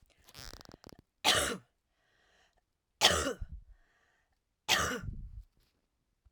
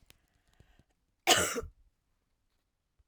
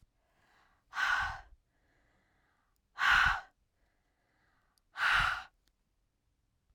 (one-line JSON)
{"three_cough_length": "6.3 s", "three_cough_amplitude": 11995, "three_cough_signal_mean_std_ratio": 0.33, "cough_length": "3.1 s", "cough_amplitude": 12393, "cough_signal_mean_std_ratio": 0.25, "exhalation_length": "6.7 s", "exhalation_amplitude": 5652, "exhalation_signal_mean_std_ratio": 0.35, "survey_phase": "alpha (2021-03-01 to 2021-08-12)", "age": "45-64", "gender": "Female", "wearing_mask": "No", "symptom_none": true, "smoker_status": "Never smoked", "respiratory_condition_asthma": false, "respiratory_condition_other": false, "recruitment_source": "REACT", "submission_delay": "2 days", "covid_test_result": "Negative", "covid_test_method": "RT-qPCR"}